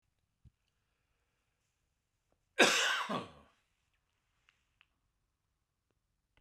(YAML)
cough_length: 6.4 s
cough_amplitude: 9395
cough_signal_mean_std_ratio: 0.22
survey_phase: beta (2021-08-13 to 2022-03-07)
age: 45-64
gender: Male
wearing_mask: 'No'
symptom_fatigue: true
symptom_headache: true
smoker_status: Ex-smoker
respiratory_condition_asthma: false
respiratory_condition_other: false
recruitment_source: REACT
submission_delay: 1 day
covid_test_result: Positive
covid_test_method: RT-qPCR
covid_ct_value: 29.0
covid_ct_gene: E gene